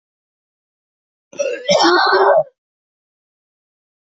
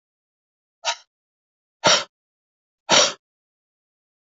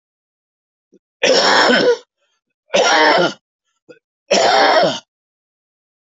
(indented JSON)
{
  "cough_length": "4.1 s",
  "cough_amplitude": 26566,
  "cough_signal_mean_std_ratio": 0.4,
  "exhalation_length": "4.3 s",
  "exhalation_amplitude": 32698,
  "exhalation_signal_mean_std_ratio": 0.25,
  "three_cough_length": "6.1 s",
  "three_cough_amplitude": 28041,
  "three_cough_signal_mean_std_ratio": 0.51,
  "survey_phase": "beta (2021-08-13 to 2022-03-07)",
  "age": "65+",
  "gender": "Male",
  "wearing_mask": "No",
  "symptom_none": true,
  "smoker_status": "Ex-smoker",
  "respiratory_condition_asthma": false,
  "respiratory_condition_other": false,
  "recruitment_source": "REACT",
  "submission_delay": "2 days",
  "covid_test_result": "Negative",
  "covid_test_method": "RT-qPCR",
  "influenza_a_test_result": "Unknown/Void",
  "influenza_b_test_result": "Unknown/Void"
}